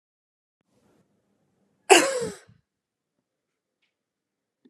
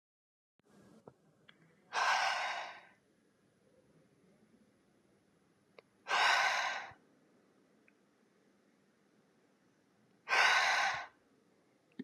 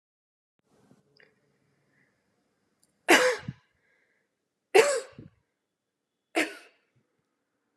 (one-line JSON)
{"cough_length": "4.7 s", "cough_amplitude": 29186, "cough_signal_mean_std_ratio": 0.18, "exhalation_length": "12.0 s", "exhalation_amplitude": 5579, "exhalation_signal_mean_std_ratio": 0.36, "three_cough_length": "7.8 s", "three_cough_amplitude": 17923, "three_cough_signal_mean_std_ratio": 0.22, "survey_phase": "beta (2021-08-13 to 2022-03-07)", "age": "18-44", "gender": "Female", "wearing_mask": "No", "symptom_none": true, "smoker_status": "Current smoker (1 to 10 cigarettes per day)", "respiratory_condition_asthma": false, "respiratory_condition_other": false, "recruitment_source": "REACT", "submission_delay": "1 day", "covid_test_result": "Negative", "covid_test_method": "RT-qPCR"}